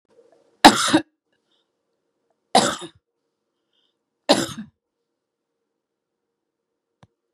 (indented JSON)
{
  "three_cough_length": "7.3 s",
  "three_cough_amplitude": 32768,
  "three_cough_signal_mean_std_ratio": 0.2,
  "survey_phase": "beta (2021-08-13 to 2022-03-07)",
  "age": "65+",
  "gender": "Female",
  "wearing_mask": "No",
  "symptom_none": true,
  "smoker_status": "Never smoked",
  "respiratory_condition_asthma": false,
  "respiratory_condition_other": false,
  "recruitment_source": "REACT",
  "submission_delay": "2 days",
  "covid_test_result": "Negative",
  "covid_test_method": "RT-qPCR",
  "influenza_a_test_result": "Negative",
  "influenza_b_test_result": "Negative"
}